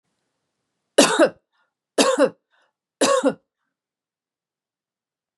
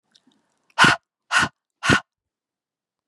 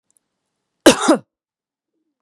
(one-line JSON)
{"three_cough_length": "5.4 s", "three_cough_amplitude": 31035, "three_cough_signal_mean_std_ratio": 0.31, "exhalation_length": "3.1 s", "exhalation_amplitude": 30515, "exhalation_signal_mean_std_ratio": 0.3, "cough_length": "2.2 s", "cough_amplitude": 32768, "cough_signal_mean_std_ratio": 0.25, "survey_phase": "beta (2021-08-13 to 2022-03-07)", "age": "45-64", "gender": "Female", "wearing_mask": "No", "symptom_runny_or_blocked_nose": true, "symptom_headache": true, "smoker_status": "Never smoked", "respiratory_condition_asthma": false, "respiratory_condition_other": false, "recruitment_source": "Test and Trace", "submission_delay": "1 day", "covid_test_result": "Positive", "covid_test_method": "ePCR"}